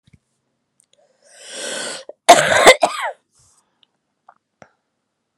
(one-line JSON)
{"cough_length": "5.4 s", "cough_amplitude": 32768, "cough_signal_mean_std_ratio": 0.27, "survey_phase": "beta (2021-08-13 to 2022-03-07)", "age": "45-64", "gender": "Female", "wearing_mask": "No", "symptom_new_continuous_cough": true, "symptom_runny_or_blocked_nose": true, "symptom_shortness_of_breath": true, "symptom_sore_throat": true, "symptom_diarrhoea": true, "symptom_fatigue": true, "symptom_onset": "4 days", "smoker_status": "Never smoked", "respiratory_condition_asthma": false, "respiratory_condition_other": false, "recruitment_source": "Test and Trace", "submission_delay": "0 days", "covid_test_result": "Positive", "covid_test_method": "LAMP"}